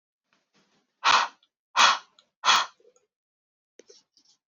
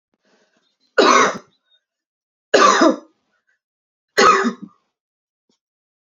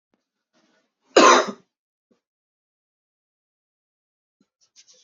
{
  "exhalation_length": "4.5 s",
  "exhalation_amplitude": 17628,
  "exhalation_signal_mean_std_ratio": 0.29,
  "three_cough_length": "6.1 s",
  "three_cough_amplitude": 32767,
  "three_cough_signal_mean_std_ratio": 0.35,
  "cough_length": "5.0 s",
  "cough_amplitude": 30395,
  "cough_signal_mean_std_ratio": 0.19,
  "survey_phase": "beta (2021-08-13 to 2022-03-07)",
  "age": "18-44",
  "gender": "Female",
  "wearing_mask": "No",
  "symptom_cough_any": true,
  "symptom_shortness_of_breath": true,
  "symptom_sore_throat": true,
  "symptom_fatigue": true,
  "symptom_headache": true,
  "symptom_change_to_sense_of_smell_or_taste": true,
  "symptom_onset": "3 days",
  "smoker_status": "Current smoker (e-cigarettes or vapes only)",
  "respiratory_condition_asthma": false,
  "respiratory_condition_other": false,
  "recruitment_source": "Test and Trace",
  "submission_delay": "2 days",
  "covid_test_result": "Positive",
  "covid_test_method": "ePCR"
}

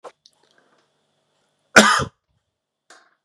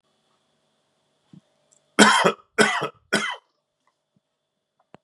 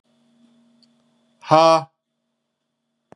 {
  "cough_length": "3.2 s",
  "cough_amplitude": 32768,
  "cough_signal_mean_std_ratio": 0.21,
  "three_cough_length": "5.0 s",
  "three_cough_amplitude": 30985,
  "three_cough_signal_mean_std_ratio": 0.29,
  "exhalation_length": "3.2 s",
  "exhalation_amplitude": 31779,
  "exhalation_signal_mean_std_ratio": 0.24,
  "survey_phase": "beta (2021-08-13 to 2022-03-07)",
  "age": "45-64",
  "gender": "Male",
  "wearing_mask": "No",
  "symptom_runny_or_blocked_nose": true,
  "symptom_fatigue": true,
  "symptom_headache": true,
  "symptom_onset": "3 days",
  "smoker_status": "Never smoked",
  "respiratory_condition_asthma": false,
  "respiratory_condition_other": false,
  "recruitment_source": "Test and Trace",
  "submission_delay": "2 days",
  "covid_test_result": "Positive",
  "covid_test_method": "RT-qPCR",
  "covid_ct_value": 22.6,
  "covid_ct_gene": "ORF1ab gene"
}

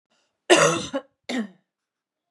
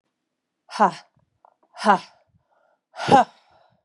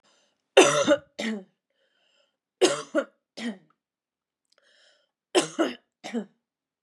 {
  "cough_length": "2.3 s",
  "cough_amplitude": 29245,
  "cough_signal_mean_std_ratio": 0.35,
  "exhalation_length": "3.8 s",
  "exhalation_amplitude": 24669,
  "exhalation_signal_mean_std_ratio": 0.27,
  "three_cough_length": "6.8 s",
  "three_cough_amplitude": 22920,
  "three_cough_signal_mean_std_ratio": 0.31,
  "survey_phase": "beta (2021-08-13 to 2022-03-07)",
  "age": "18-44",
  "gender": "Female",
  "wearing_mask": "No",
  "symptom_runny_or_blocked_nose": true,
  "symptom_shortness_of_breath": true,
  "symptom_sore_throat": true,
  "symptom_fatigue": true,
  "symptom_headache": true,
  "smoker_status": "Never smoked",
  "respiratory_condition_asthma": false,
  "respiratory_condition_other": false,
  "recruitment_source": "Test and Trace",
  "submission_delay": "1 day",
  "covid_test_result": "Positive",
  "covid_test_method": "LFT"
}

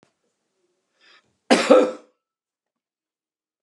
{
  "cough_length": "3.6 s",
  "cough_amplitude": 30932,
  "cough_signal_mean_std_ratio": 0.24,
  "survey_phase": "beta (2021-08-13 to 2022-03-07)",
  "age": "65+",
  "gender": "Male",
  "wearing_mask": "No",
  "symptom_cough_any": true,
  "symptom_runny_or_blocked_nose": true,
  "symptom_fatigue": true,
  "smoker_status": "Never smoked",
  "respiratory_condition_asthma": false,
  "respiratory_condition_other": false,
  "recruitment_source": "Test and Trace",
  "submission_delay": "2 days",
  "covid_test_result": "Positive",
  "covid_test_method": "ePCR"
}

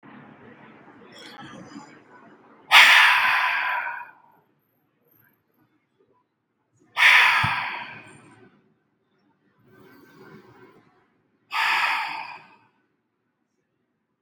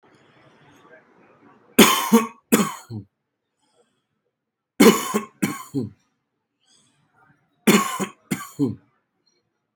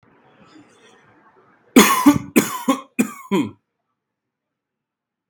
{
  "exhalation_length": "14.2 s",
  "exhalation_amplitude": 32767,
  "exhalation_signal_mean_std_ratio": 0.33,
  "three_cough_length": "9.8 s",
  "three_cough_amplitude": 32768,
  "three_cough_signal_mean_std_ratio": 0.3,
  "cough_length": "5.3 s",
  "cough_amplitude": 32768,
  "cough_signal_mean_std_ratio": 0.31,
  "survey_phase": "beta (2021-08-13 to 2022-03-07)",
  "age": "18-44",
  "gender": "Male",
  "wearing_mask": "No",
  "symptom_none": true,
  "smoker_status": "Ex-smoker",
  "respiratory_condition_asthma": false,
  "respiratory_condition_other": false,
  "recruitment_source": "REACT",
  "submission_delay": "0 days",
  "covid_test_result": "Negative",
  "covid_test_method": "RT-qPCR"
}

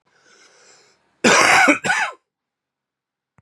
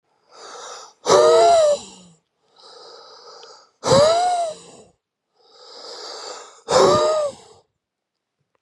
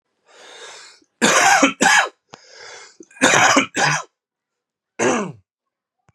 {
  "cough_length": "3.4 s",
  "cough_amplitude": 31496,
  "cough_signal_mean_std_ratio": 0.39,
  "exhalation_length": "8.6 s",
  "exhalation_amplitude": 28590,
  "exhalation_signal_mean_std_ratio": 0.46,
  "three_cough_length": "6.1 s",
  "three_cough_amplitude": 32767,
  "three_cough_signal_mean_std_ratio": 0.45,
  "survey_phase": "beta (2021-08-13 to 2022-03-07)",
  "age": "18-44",
  "gender": "Male",
  "wearing_mask": "No",
  "symptom_cough_any": true,
  "symptom_runny_or_blocked_nose": true,
  "symptom_sore_throat": true,
  "symptom_headache": true,
  "symptom_onset": "3 days",
  "smoker_status": "Never smoked",
  "respiratory_condition_asthma": false,
  "respiratory_condition_other": false,
  "recruitment_source": "Test and Trace",
  "submission_delay": "1 day",
  "covid_test_result": "Positive",
  "covid_test_method": "RT-qPCR",
  "covid_ct_value": 10.2,
  "covid_ct_gene": "ORF1ab gene"
}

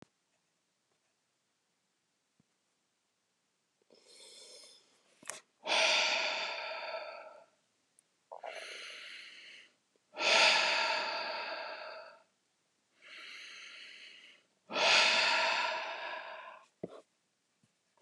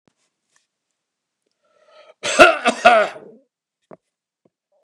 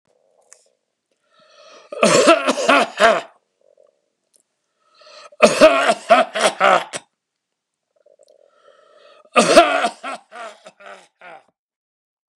{
  "exhalation_length": "18.0 s",
  "exhalation_amplitude": 8430,
  "exhalation_signal_mean_std_ratio": 0.42,
  "cough_length": "4.8 s",
  "cough_amplitude": 32768,
  "cough_signal_mean_std_ratio": 0.27,
  "three_cough_length": "12.4 s",
  "three_cough_amplitude": 32768,
  "three_cough_signal_mean_std_ratio": 0.36,
  "survey_phase": "beta (2021-08-13 to 2022-03-07)",
  "age": "65+",
  "gender": "Male",
  "wearing_mask": "No",
  "symptom_none": true,
  "smoker_status": "Never smoked",
  "respiratory_condition_asthma": false,
  "respiratory_condition_other": false,
  "recruitment_source": "REACT",
  "submission_delay": "2 days",
  "covid_test_result": "Negative",
  "covid_test_method": "RT-qPCR",
  "influenza_a_test_result": "Negative",
  "influenza_b_test_result": "Negative"
}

